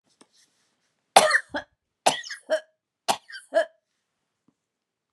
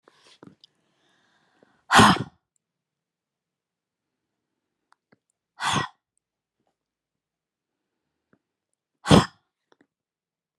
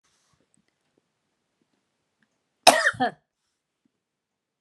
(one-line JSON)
{"three_cough_length": "5.1 s", "three_cough_amplitude": 32767, "three_cough_signal_mean_std_ratio": 0.26, "exhalation_length": "10.6 s", "exhalation_amplitude": 29384, "exhalation_signal_mean_std_ratio": 0.18, "cough_length": "4.6 s", "cough_amplitude": 32767, "cough_signal_mean_std_ratio": 0.18, "survey_phase": "beta (2021-08-13 to 2022-03-07)", "age": "65+", "gender": "Female", "wearing_mask": "No", "symptom_none": true, "smoker_status": "Never smoked", "respiratory_condition_asthma": false, "respiratory_condition_other": false, "recruitment_source": "REACT", "submission_delay": "2 days", "covid_test_result": "Negative", "covid_test_method": "RT-qPCR"}